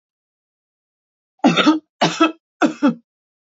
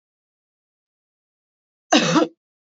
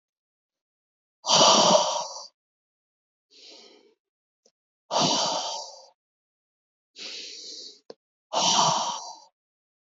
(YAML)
three_cough_length: 3.5 s
three_cough_amplitude: 27516
three_cough_signal_mean_std_ratio: 0.37
cough_length: 2.7 s
cough_amplitude: 29482
cough_signal_mean_std_ratio: 0.27
exhalation_length: 10.0 s
exhalation_amplitude: 18233
exhalation_signal_mean_std_ratio: 0.38
survey_phase: beta (2021-08-13 to 2022-03-07)
age: 18-44
gender: Female
wearing_mask: 'No'
symptom_cough_any: true
symptom_runny_or_blocked_nose: true
symptom_fatigue: true
symptom_onset: 10 days
smoker_status: Never smoked
respiratory_condition_asthma: false
respiratory_condition_other: false
recruitment_source: Test and Trace
submission_delay: 2 days
covid_test_result: Positive
covid_test_method: RT-qPCR
covid_ct_value: 23.4
covid_ct_gene: N gene